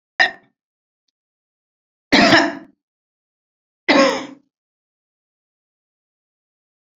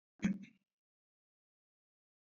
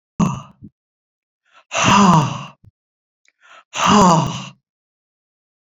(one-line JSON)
{"three_cough_length": "7.0 s", "three_cough_amplitude": 28716, "three_cough_signal_mean_std_ratio": 0.27, "cough_length": "2.4 s", "cough_amplitude": 2239, "cough_signal_mean_std_ratio": 0.2, "exhalation_length": "5.6 s", "exhalation_amplitude": 29510, "exhalation_signal_mean_std_ratio": 0.41, "survey_phase": "beta (2021-08-13 to 2022-03-07)", "age": "45-64", "gender": "Female", "wearing_mask": "No", "symptom_none": true, "smoker_status": "Never smoked", "respiratory_condition_asthma": false, "respiratory_condition_other": false, "recruitment_source": "REACT", "submission_delay": "2 days", "covid_test_result": "Negative", "covid_test_method": "RT-qPCR"}